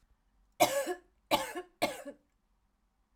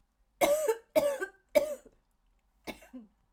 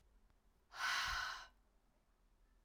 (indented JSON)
{
  "cough_length": "3.2 s",
  "cough_amplitude": 9351,
  "cough_signal_mean_std_ratio": 0.35,
  "three_cough_length": "3.3 s",
  "three_cough_amplitude": 9349,
  "three_cough_signal_mean_std_ratio": 0.41,
  "exhalation_length": "2.6 s",
  "exhalation_amplitude": 1117,
  "exhalation_signal_mean_std_ratio": 0.45,
  "survey_phase": "alpha (2021-03-01 to 2021-08-12)",
  "age": "45-64",
  "gender": "Female",
  "wearing_mask": "No",
  "symptom_shortness_of_breath": true,
  "symptom_headache": true,
  "symptom_onset": "4 days",
  "smoker_status": "Ex-smoker",
  "respiratory_condition_asthma": false,
  "respiratory_condition_other": false,
  "recruitment_source": "Test and Trace",
  "submission_delay": "0 days",
  "covid_test_result": "Positive",
  "covid_test_method": "RT-qPCR",
  "covid_ct_value": 18.1,
  "covid_ct_gene": "ORF1ab gene",
  "covid_ct_mean": 18.7,
  "covid_viral_load": "720000 copies/ml",
  "covid_viral_load_category": "Low viral load (10K-1M copies/ml)"
}